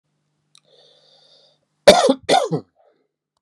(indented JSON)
{
  "cough_length": "3.4 s",
  "cough_amplitude": 32768,
  "cough_signal_mean_std_ratio": 0.28,
  "survey_phase": "beta (2021-08-13 to 2022-03-07)",
  "age": "18-44",
  "gender": "Male",
  "wearing_mask": "No",
  "symptom_runny_or_blocked_nose": true,
  "symptom_onset": "3 days",
  "smoker_status": "Never smoked",
  "respiratory_condition_asthma": false,
  "respiratory_condition_other": false,
  "recruitment_source": "Test and Trace",
  "submission_delay": "1 day",
  "covid_test_result": "Positive",
  "covid_test_method": "RT-qPCR"
}